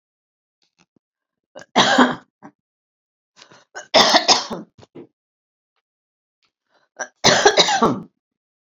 {"three_cough_length": "8.6 s", "three_cough_amplitude": 32768, "three_cough_signal_mean_std_ratio": 0.33, "survey_phase": "beta (2021-08-13 to 2022-03-07)", "age": "65+", "gender": "Female", "wearing_mask": "No", "symptom_none": true, "smoker_status": "Never smoked", "respiratory_condition_asthma": false, "respiratory_condition_other": false, "recruitment_source": "REACT", "submission_delay": "4 days", "covid_test_result": "Negative", "covid_test_method": "RT-qPCR"}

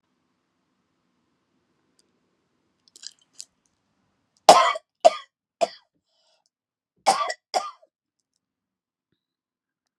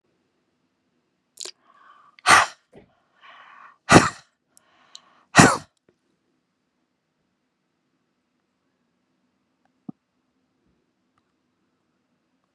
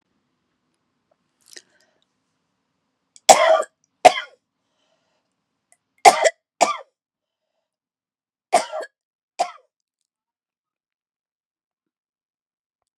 {"cough_length": "10.0 s", "cough_amplitude": 32768, "cough_signal_mean_std_ratio": 0.17, "exhalation_length": "12.5 s", "exhalation_amplitude": 32768, "exhalation_signal_mean_std_ratio": 0.17, "three_cough_length": "13.0 s", "three_cough_amplitude": 32768, "three_cough_signal_mean_std_ratio": 0.18, "survey_phase": "beta (2021-08-13 to 2022-03-07)", "age": "65+", "gender": "Female", "wearing_mask": "No", "symptom_sore_throat": true, "symptom_loss_of_taste": true, "smoker_status": "Never smoked", "respiratory_condition_asthma": false, "respiratory_condition_other": false, "recruitment_source": "REACT", "submission_delay": "1 day", "covid_test_result": "Negative", "covid_test_method": "RT-qPCR"}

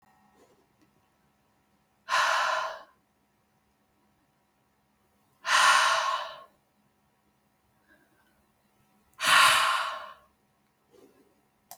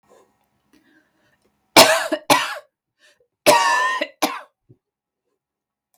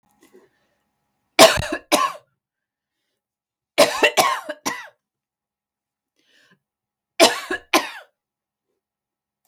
{"exhalation_length": "11.8 s", "exhalation_amplitude": 16868, "exhalation_signal_mean_std_ratio": 0.34, "cough_length": "6.0 s", "cough_amplitude": 32768, "cough_signal_mean_std_ratio": 0.33, "three_cough_length": "9.5 s", "three_cough_amplitude": 32768, "three_cough_signal_mean_std_ratio": 0.27, "survey_phase": "beta (2021-08-13 to 2022-03-07)", "age": "45-64", "gender": "Female", "wearing_mask": "No", "symptom_none": true, "smoker_status": "Never smoked", "respiratory_condition_asthma": false, "respiratory_condition_other": false, "recruitment_source": "REACT", "submission_delay": "1 day", "covid_test_result": "Negative", "covid_test_method": "RT-qPCR", "influenza_a_test_result": "Negative", "influenza_b_test_result": "Negative"}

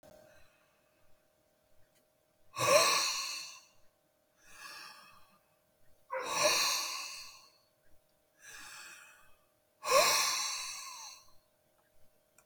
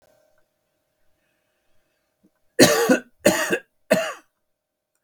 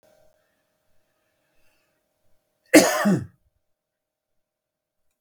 {"exhalation_length": "12.5 s", "exhalation_amplitude": 7990, "exhalation_signal_mean_std_ratio": 0.39, "three_cough_length": "5.0 s", "three_cough_amplitude": 32766, "three_cough_signal_mean_std_ratio": 0.31, "cough_length": "5.2 s", "cough_amplitude": 32766, "cough_signal_mean_std_ratio": 0.21, "survey_phase": "beta (2021-08-13 to 2022-03-07)", "age": "65+", "gender": "Male", "wearing_mask": "No", "symptom_none": true, "smoker_status": "Ex-smoker", "respiratory_condition_asthma": false, "respiratory_condition_other": false, "recruitment_source": "REACT", "submission_delay": "1 day", "covid_test_result": "Negative", "covid_test_method": "RT-qPCR", "influenza_a_test_result": "Negative", "influenza_b_test_result": "Negative"}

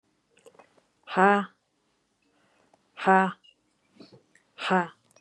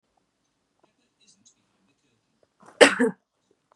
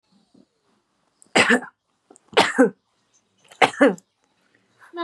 {"exhalation_length": "5.2 s", "exhalation_amplitude": 18038, "exhalation_signal_mean_std_ratio": 0.27, "cough_length": "3.8 s", "cough_amplitude": 32767, "cough_signal_mean_std_ratio": 0.17, "three_cough_length": "5.0 s", "three_cough_amplitude": 30565, "three_cough_signal_mean_std_ratio": 0.3, "survey_phase": "beta (2021-08-13 to 2022-03-07)", "age": "18-44", "gender": "Female", "wearing_mask": "Yes", "symptom_none": true, "smoker_status": "Never smoked", "respiratory_condition_asthma": false, "respiratory_condition_other": false, "recruitment_source": "REACT", "submission_delay": "2 days", "covid_test_result": "Negative", "covid_test_method": "RT-qPCR", "influenza_a_test_result": "Negative", "influenza_b_test_result": "Negative"}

